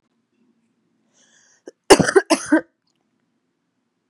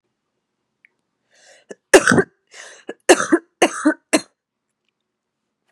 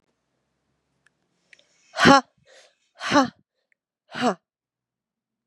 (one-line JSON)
{"cough_length": "4.1 s", "cough_amplitude": 32768, "cough_signal_mean_std_ratio": 0.23, "three_cough_length": "5.7 s", "three_cough_amplitude": 32768, "three_cough_signal_mean_std_ratio": 0.26, "exhalation_length": "5.5 s", "exhalation_amplitude": 32387, "exhalation_signal_mean_std_ratio": 0.23, "survey_phase": "beta (2021-08-13 to 2022-03-07)", "age": "18-44", "gender": "Female", "wearing_mask": "No", "symptom_cough_any": true, "symptom_runny_or_blocked_nose": true, "symptom_fatigue": true, "symptom_fever_high_temperature": true, "symptom_headache": true, "symptom_onset": "3 days", "smoker_status": "Ex-smoker", "respiratory_condition_asthma": false, "respiratory_condition_other": false, "recruitment_source": "Test and Trace", "submission_delay": "2 days", "covid_test_result": "Positive", "covid_test_method": "RT-qPCR", "covid_ct_value": 23.9, "covid_ct_gene": "ORF1ab gene", "covid_ct_mean": 24.8, "covid_viral_load": "7600 copies/ml", "covid_viral_load_category": "Minimal viral load (< 10K copies/ml)"}